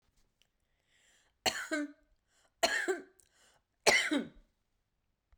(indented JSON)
{
  "three_cough_length": "5.4 s",
  "three_cough_amplitude": 10126,
  "three_cough_signal_mean_std_ratio": 0.33,
  "survey_phase": "beta (2021-08-13 to 2022-03-07)",
  "age": "65+",
  "gender": "Male",
  "wearing_mask": "No",
  "symptom_fatigue": true,
  "symptom_change_to_sense_of_smell_or_taste": true,
  "smoker_status": "Never smoked",
  "respiratory_condition_asthma": true,
  "respiratory_condition_other": false,
  "recruitment_source": "Test and Trace",
  "submission_delay": "1 day",
  "covid_test_result": "Negative",
  "covid_test_method": "ePCR"
}